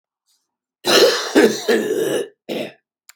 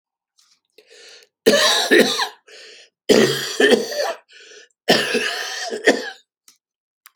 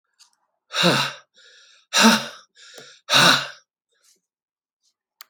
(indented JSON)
{
  "cough_length": "3.2 s",
  "cough_amplitude": 31683,
  "cough_signal_mean_std_ratio": 0.53,
  "three_cough_length": "7.2 s",
  "three_cough_amplitude": 30153,
  "three_cough_signal_mean_std_ratio": 0.47,
  "exhalation_length": "5.3 s",
  "exhalation_amplitude": 29041,
  "exhalation_signal_mean_std_ratio": 0.35,
  "survey_phase": "alpha (2021-03-01 to 2021-08-12)",
  "age": "65+",
  "gender": "Male",
  "wearing_mask": "No",
  "symptom_cough_any": true,
  "symptom_shortness_of_breath": true,
  "symptom_fatigue": true,
  "symptom_change_to_sense_of_smell_or_taste": true,
  "smoker_status": "Ex-smoker",
  "respiratory_condition_asthma": false,
  "respiratory_condition_other": false,
  "recruitment_source": "Test and Trace",
  "submission_delay": "3 days",
  "covid_test_result": "Positive",
  "covid_test_method": "LFT"
}